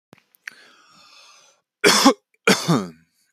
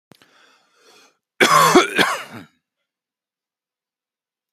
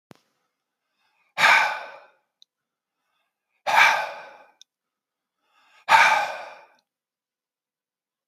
three_cough_length: 3.3 s
three_cough_amplitude: 30055
three_cough_signal_mean_std_ratio: 0.34
cough_length: 4.5 s
cough_amplitude: 29072
cough_signal_mean_std_ratio: 0.31
exhalation_length: 8.3 s
exhalation_amplitude: 25940
exhalation_signal_mean_std_ratio: 0.3
survey_phase: beta (2021-08-13 to 2022-03-07)
age: 45-64
gender: Male
wearing_mask: 'No'
symptom_none: true
smoker_status: Ex-smoker
respiratory_condition_asthma: false
respiratory_condition_other: false
recruitment_source: REACT
submission_delay: 1 day
covid_test_result: Negative
covid_test_method: RT-qPCR
influenza_a_test_result: Negative
influenza_b_test_result: Negative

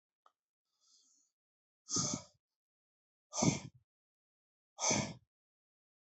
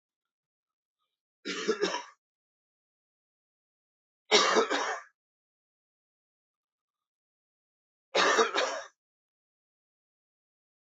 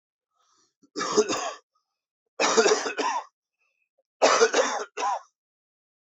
exhalation_length: 6.1 s
exhalation_amplitude: 4473
exhalation_signal_mean_std_ratio: 0.28
three_cough_length: 10.8 s
three_cough_amplitude: 11492
three_cough_signal_mean_std_ratio: 0.29
cough_length: 6.1 s
cough_amplitude: 17718
cough_signal_mean_std_ratio: 0.44
survey_phase: beta (2021-08-13 to 2022-03-07)
age: 65+
gender: Male
wearing_mask: 'No'
symptom_cough_any: true
symptom_runny_or_blocked_nose: true
symptom_onset: 4 days
smoker_status: Never smoked
respiratory_condition_asthma: false
respiratory_condition_other: false
recruitment_source: Test and Trace
submission_delay: 2 days
covid_test_result: Positive
covid_test_method: RT-qPCR
covid_ct_value: 18.7
covid_ct_gene: ORF1ab gene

